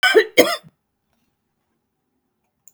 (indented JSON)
{
  "cough_length": "2.7 s",
  "cough_amplitude": 32768,
  "cough_signal_mean_std_ratio": 0.28,
  "survey_phase": "beta (2021-08-13 to 2022-03-07)",
  "age": "65+",
  "gender": "Female",
  "wearing_mask": "No",
  "symptom_none": true,
  "smoker_status": "Ex-smoker",
  "respiratory_condition_asthma": false,
  "respiratory_condition_other": false,
  "recruitment_source": "REACT",
  "submission_delay": "2 days",
  "covid_test_result": "Negative",
  "covid_test_method": "RT-qPCR",
  "influenza_a_test_result": "Unknown/Void",
  "influenza_b_test_result": "Unknown/Void"
}